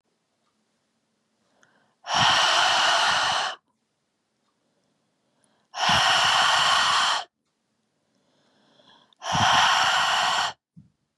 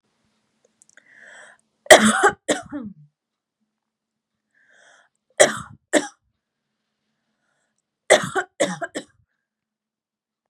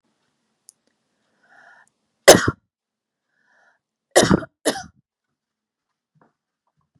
{
  "exhalation_length": "11.2 s",
  "exhalation_amplitude": 17550,
  "exhalation_signal_mean_std_ratio": 0.55,
  "three_cough_length": "10.5 s",
  "three_cough_amplitude": 32768,
  "three_cough_signal_mean_std_ratio": 0.23,
  "cough_length": "7.0 s",
  "cough_amplitude": 32768,
  "cough_signal_mean_std_ratio": 0.18,
  "survey_phase": "beta (2021-08-13 to 2022-03-07)",
  "age": "18-44",
  "gender": "Female",
  "wearing_mask": "No",
  "symptom_cough_any": true,
  "symptom_runny_or_blocked_nose": true,
  "symptom_sore_throat": true,
  "symptom_onset": "4 days",
  "smoker_status": "Never smoked",
  "respiratory_condition_asthma": false,
  "respiratory_condition_other": false,
  "recruitment_source": "REACT",
  "submission_delay": "1 day",
  "covid_test_result": "Negative",
  "covid_test_method": "RT-qPCR",
  "influenza_a_test_result": "Unknown/Void",
  "influenza_b_test_result": "Unknown/Void"
}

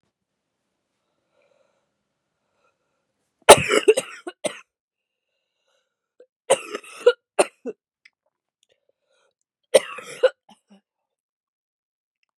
{
  "three_cough_length": "12.4 s",
  "three_cough_amplitude": 32768,
  "three_cough_signal_mean_std_ratio": 0.18,
  "survey_phase": "beta (2021-08-13 to 2022-03-07)",
  "age": "18-44",
  "gender": "Female",
  "wearing_mask": "No",
  "symptom_cough_any": true,
  "symptom_runny_or_blocked_nose": true,
  "symptom_fatigue": true,
  "symptom_fever_high_temperature": true,
  "symptom_headache": true,
  "symptom_change_to_sense_of_smell_or_taste": true,
  "symptom_other": true,
  "smoker_status": "Never smoked",
  "respiratory_condition_asthma": false,
  "respiratory_condition_other": false,
  "recruitment_source": "Test and Trace",
  "submission_delay": "1 day",
  "covid_test_result": "Positive",
  "covid_test_method": "RT-qPCR",
  "covid_ct_value": 29.0,
  "covid_ct_gene": "ORF1ab gene",
  "covid_ct_mean": 29.5,
  "covid_viral_load": "210 copies/ml",
  "covid_viral_load_category": "Minimal viral load (< 10K copies/ml)"
}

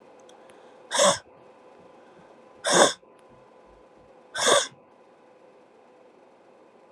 {
  "exhalation_length": "6.9 s",
  "exhalation_amplitude": 24206,
  "exhalation_signal_mean_std_ratio": 0.31,
  "survey_phase": "beta (2021-08-13 to 2022-03-07)",
  "age": "18-44",
  "gender": "Female",
  "wearing_mask": "No",
  "symptom_cough_any": true,
  "symptom_runny_or_blocked_nose": true,
  "symptom_shortness_of_breath": true,
  "symptom_fatigue": true,
  "symptom_headache": true,
  "symptom_change_to_sense_of_smell_or_taste": true,
  "symptom_loss_of_taste": true,
  "symptom_other": true,
  "symptom_onset": "5 days",
  "smoker_status": "Never smoked",
  "respiratory_condition_asthma": false,
  "respiratory_condition_other": false,
  "recruitment_source": "Test and Trace",
  "submission_delay": "2 days",
  "covid_test_result": "Positive",
  "covid_test_method": "RT-qPCR",
  "covid_ct_value": 19.2,
  "covid_ct_gene": "ORF1ab gene",
  "covid_ct_mean": 19.3,
  "covid_viral_load": "480000 copies/ml",
  "covid_viral_load_category": "Low viral load (10K-1M copies/ml)"
}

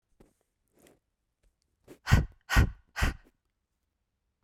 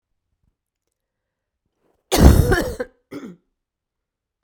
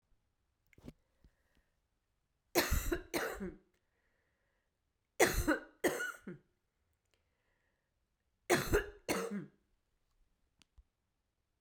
{
  "exhalation_length": "4.4 s",
  "exhalation_amplitude": 13594,
  "exhalation_signal_mean_std_ratio": 0.26,
  "cough_length": "4.4 s",
  "cough_amplitude": 32768,
  "cough_signal_mean_std_ratio": 0.27,
  "three_cough_length": "11.6 s",
  "three_cough_amplitude": 8123,
  "three_cough_signal_mean_std_ratio": 0.32,
  "survey_phase": "beta (2021-08-13 to 2022-03-07)",
  "age": "45-64",
  "gender": "Female",
  "wearing_mask": "No",
  "symptom_cough_any": true,
  "symptom_runny_or_blocked_nose": true,
  "symptom_fatigue": true,
  "symptom_headache": true,
  "symptom_onset": "3 days",
  "smoker_status": "Never smoked",
  "respiratory_condition_asthma": false,
  "respiratory_condition_other": false,
  "recruitment_source": "Test and Trace",
  "submission_delay": "2 days",
  "covid_test_result": "Positive",
  "covid_test_method": "RT-qPCR",
  "covid_ct_value": 17.9,
  "covid_ct_gene": "ORF1ab gene",
  "covid_ct_mean": 18.2,
  "covid_viral_load": "1100000 copies/ml",
  "covid_viral_load_category": "High viral load (>1M copies/ml)"
}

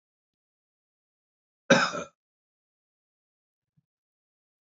{
  "cough_length": "4.8 s",
  "cough_amplitude": 18284,
  "cough_signal_mean_std_ratio": 0.16,
  "survey_phase": "beta (2021-08-13 to 2022-03-07)",
  "age": "45-64",
  "gender": "Male",
  "wearing_mask": "No",
  "symptom_none": true,
  "smoker_status": "Current smoker (e-cigarettes or vapes only)",
  "respiratory_condition_asthma": false,
  "respiratory_condition_other": false,
  "recruitment_source": "REACT",
  "submission_delay": "1 day",
  "covid_test_result": "Negative",
  "covid_test_method": "RT-qPCR",
  "influenza_a_test_result": "Negative",
  "influenza_b_test_result": "Negative"
}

